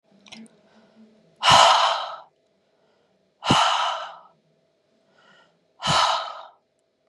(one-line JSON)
{"exhalation_length": "7.1 s", "exhalation_amplitude": 25323, "exhalation_signal_mean_std_ratio": 0.38, "survey_phase": "beta (2021-08-13 to 2022-03-07)", "age": "45-64", "gender": "Male", "wearing_mask": "No", "symptom_none": true, "smoker_status": "Never smoked", "respiratory_condition_asthma": false, "respiratory_condition_other": false, "recruitment_source": "REACT", "submission_delay": "2 days", "covid_test_result": "Negative", "covid_test_method": "RT-qPCR", "influenza_a_test_result": "Unknown/Void", "influenza_b_test_result": "Unknown/Void"}